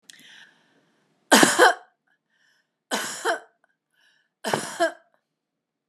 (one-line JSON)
{"three_cough_length": "5.9 s", "three_cough_amplitude": 32502, "three_cough_signal_mean_std_ratio": 0.29, "survey_phase": "beta (2021-08-13 to 2022-03-07)", "age": "65+", "gender": "Female", "wearing_mask": "No", "symptom_none": true, "smoker_status": "Never smoked", "respiratory_condition_asthma": false, "respiratory_condition_other": false, "recruitment_source": "REACT", "submission_delay": "7 days", "covid_test_result": "Negative", "covid_test_method": "RT-qPCR", "influenza_a_test_result": "Unknown/Void", "influenza_b_test_result": "Unknown/Void"}